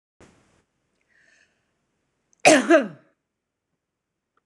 {
  "cough_length": "4.5 s",
  "cough_amplitude": 26028,
  "cough_signal_mean_std_ratio": 0.22,
  "survey_phase": "beta (2021-08-13 to 2022-03-07)",
  "age": "45-64",
  "gender": "Female",
  "wearing_mask": "No",
  "symptom_none": true,
  "smoker_status": "Ex-smoker",
  "respiratory_condition_asthma": false,
  "respiratory_condition_other": false,
  "recruitment_source": "REACT",
  "submission_delay": "1 day",
  "covid_test_result": "Negative",
  "covid_test_method": "RT-qPCR",
  "influenza_a_test_result": "Negative",
  "influenza_b_test_result": "Negative"
}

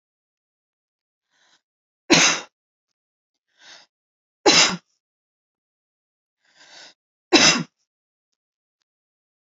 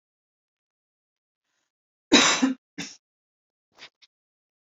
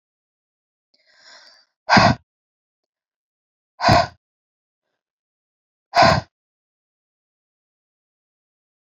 {
  "three_cough_length": "9.6 s",
  "three_cough_amplitude": 31127,
  "three_cough_signal_mean_std_ratio": 0.23,
  "cough_length": "4.7 s",
  "cough_amplitude": 25226,
  "cough_signal_mean_std_ratio": 0.23,
  "exhalation_length": "8.9 s",
  "exhalation_amplitude": 30138,
  "exhalation_signal_mean_std_ratio": 0.23,
  "survey_phase": "alpha (2021-03-01 to 2021-08-12)",
  "age": "45-64",
  "gender": "Female",
  "wearing_mask": "No",
  "symptom_none": true,
  "smoker_status": "Ex-smoker",
  "respiratory_condition_asthma": false,
  "respiratory_condition_other": false,
  "recruitment_source": "REACT",
  "submission_delay": "1 day",
  "covid_test_result": "Negative",
  "covid_test_method": "RT-qPCR"
}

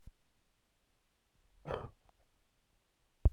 {
  "cough_length": "3.3 s",
  "cough_amplitude": 5671,
  "cough_signal_mean_std_ratio": 0.15,
  "survey_phase": "alpha (2021-03-01 to 2021-08-12)",
  "age": "18-44",
  "gender": "Male",
  "wearing_mask": "Yes",
  "symptom_cough_any": true,
  "symptom_new_continuous_cough": true,
  "symptom_fever_high_temperature": true,
  "symptom_headache": true,
  "symptom_change_to_sense_of_smell_or_taste": true,
  "symptom_loss_of_taste": true,
  "symptom_onset": "2 days",
  "smoker_status": "Current smoker (1 to 10 cigarettes per day)",
  "respiratory_condition_asthma": false,
  "respiratory_condition_other": false,
  "recruitment_source": "Test and Trace",
  "submission_delay": "2 days",
  "covid_test_result": "Positive",
  "covid_test_method": "RT-qPCR",
  "covid_ct_value": 15.4,
  "covid_ct_gene": "ORF1ab gene",
  "covid_ct_mean": 15.7,
  "covid_viral_load": "6900000 copies/ml",
  "covid_viral_load_category": "High viral load (>1M copies/ml)"
}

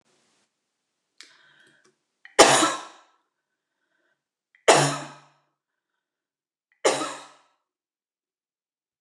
{
  "three_cough_length": "9.0 s",
  "three_cough_amplitude": 29203,
  "three_cough_signal_mean_std_ratio": 0.23,
  "survey_phase": "beta (2021-08-13 to 2022-03-07)",
  "age": "45-64",
  "gender": "Female",
  "wearing_mask": "Yes",
  "symptom_sore_throat": true,
  "symptom_headache": true,
  "smoker_status": "Never smoked",
  "respiratory_condition_asthma": true,
  "respiratory_condition_other": false,
  "recruitment_source": "REACT",
  "submission_delay": "2 days",
  "covid_test_result": "Negative",
  "covid_test_method": "RT-qPCR"
}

